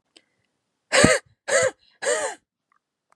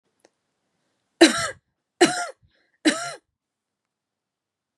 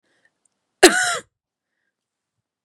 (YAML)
exhalation_length: 3.2 s
exhalation_amplitude: 32767
exhalation_signal_mean_std_ratio: 0.37
three_cough_length: 4.8 s
three_cough_amplitude: 29160
three_cough_signal_mean_std_ratio: 0.24
cough_length: 2.6 s
cough_amplitude: 32768
cough_signal_mean_std_ratio: 0.23
survey_phase: beta (2021-08-13 to 2022-03-07)
age: 18-44
gender: Female
wearing_mask: 'No'
symptom_cough_any: true
symptom_sore_throat: true
symptom_other: true
smoker_status: Never smoked
respiratory_condition_asthma: true
respiratory_condition_other: false
recruitment_source: Test and Trace
submission_delay: 2 days
covid_test_result: Positive
covid_test_method: RT-qPCR
covid_ct_value: 24.4
covid_ct_gene: ORF1ab gene